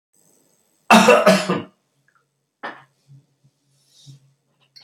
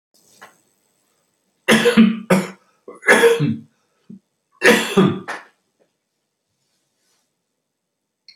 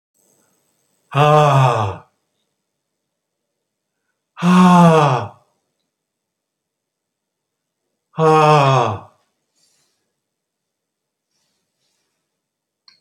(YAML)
cough_length: 4.8 s
cough_amplitude: 30145
cough_signal_mean_std_ratio: 0.29
three_cough_length: 8.4 s
three_cough_amplitude: 29676
three_cough_signal_mean_std_ratio: 0.35
exhalation_length: 13.0 s
exhalation_amplitude: 28629
exhalation_signal_mean_std_ratio: 0.35
survey_phase: beta (2021-08-13 to 2022-03-07)
age: 65+
gender: Male
wearing_mask: 'No'
symptom_cough_any: true
symptom_runny_or_blocked_nose: true
smoker_status: Ex-smoker
respiratory_condition_asthma: false
respiratory_condition_other: false
recruitment_source: REACT
submission_delay: 2 days
covid_test_result: Negative
covid_test_method: RT-qPCR